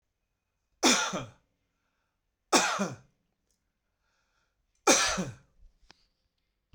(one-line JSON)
{"three_cough_length": "6.7 s", "three_cough_amplitude": 15862, "three_cough_signal_mean_std_ratio": 0.31, "survey_phase": "beta (2021-08-13 to 2022-03-07)", "age": "45-64", "gender": "Male", "wearing_mask": "No", "symptom_none": true, "smoker_status": "Ex-smoker", "respiratory_condition_asthma": false, "respiratory_condition_other": false, "recruitment_source": "Test and Trace", "submission_delay": "0 days", "covid_test_result": "Negative", "covid_test_method": "LFT"}